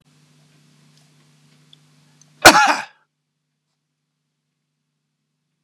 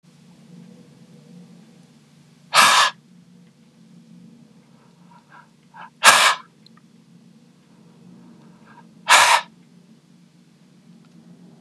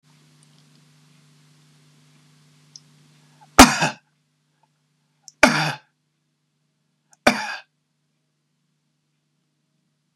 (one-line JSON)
{"cough_length": "5.6 s", "cough_amplitude": 32768, "cough_signal_mean_std_ratio": 0.18, "exhalation_length": "11.6 s", "exhalation_amplitude": 32768, "exhalation_signal_mean_std_ratio": 0.27, "three_cough_length": "10.2 s", "three_cough_amplitude": 32768, "three_cough_signal_mean_std_ratio": 0.18, "survey_phase": "beta (2021-08-13 to 2022-03-07)", "age": "65+", "gender": "Male", "wearing_mask": "No", "symptom_none": true, "smoker_status": "Ex-smoker", "respiratory_condition_asthma": false, "respiratory_condition_other": true, "recruitment_source": "REACT", "submission_delay": "1 day", "covid_test_result": "Negative", "covid_test_method": "RT-qPCR", "influenza_a_test_result": "Negative", "influenza_b_test_result": "Negative"}